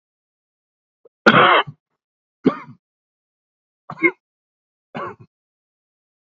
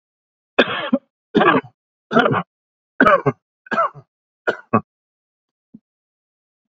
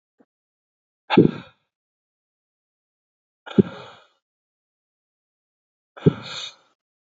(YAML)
cough_length: 6.2 s
cough_amplitude: 28908
cough_signal_mean_std_ratio: 0.24
three_cough_length: 6.7 s
three_cough_amplitude: 30461
three_cough_signal_mean_std_ratio: 0.34
exhalation_length: 7.1 s
exhalation_amplitude: 32059
exhalation_signal_mean_std_ratio: 0.17
survey_phase: beta (2021-08-13 to 2022-03-07)
age: 18-44
gender: Male
wearing_mask: 'No'
symptom_cough_any: true
symptom_sore_throat: true
smoker_status: Ex-smoker
respiratory_condition_asthma: false
respiratory_condition_other: false
recruitment_source: REACT
submission_delay: 1 day
covid_test_result: Negative
covid_test_method: RT-qPCR
influenza_a_test_result: Negative
influenza_b_test_result: Negative